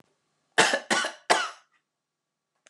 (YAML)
cough_length: 2.7 s
cough_amplitude: 20419
cough_signal_mean_std_ratio: 0.35
survey_phase: beta (2021-08-13 to 2022-03-07)
age: 45-64
gender: Female
wearing_mask: 'No'
symptom_none: true
smoker_status: Ex-smoker
respiratory_condition_asthma: false
respiratory_condition_other: false
recruitment_source: REACT
submission_delay: 2 days
covid_test_result: Negative
covid_test_method: RT-qPCR